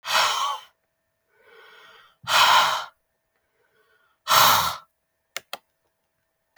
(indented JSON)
{
  "exhalation_length": "6.6 s",
  "exhalation_amplitude": 28025,
  "exhalation_signal_mean_std_ratio": 0.38,
  "survey_phase": "beta (2021-08-13 to 2022-03-07)",
  "age": "18-44",
  "gender": "Female",
  "wearing_mask": "No",
  "symptom_none": true,
  "symptom_onset": "6 days",
  "smoker_status": "Never smoked",
  "respiratory_condition_asthma": false,
  "respiratory_condition_other": false,
  "recruitment_source": "REACT",
  "submission_delay": "6 days",
  "covid_test_result": "Positive",
  "covid_test_method": "RT-qPCR",
  "covid_ct_value": 22.0,
  "covid_ct_gene": "E gene",
  "influenza_a_test_result": "Negative",
  "influenza_b_test_result": "Negative"
}